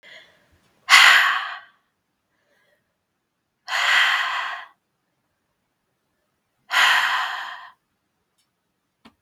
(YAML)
exhalation_length: 9.2 s
exhalation_amplitude: 32768
exhalation_signal_mean_std_ratio: 0.36
survey_phase: beta (2021-08-13 to 2022-03-07)
age: 18-44
gender: Female
wearing_mask: 'No'
symptom_cough_any: true
symptom_runny_or_blocked_nose: true
symptom_shortness_of_breath: true
symptom_fatigue: true
symptom_headache: true
symptom_change_to_sense_of_smell_or_taste: true
symptom_loss_of_taste: true
symptom_onset: 3 days
smoker_status: Never smoked
respiratory_condition_asthma: false
respiratory_condition_other: false
recruitment_source: Test and Trace
submission_delay: 1 day
covid_test_result: Positive
covid_test_method: ePCR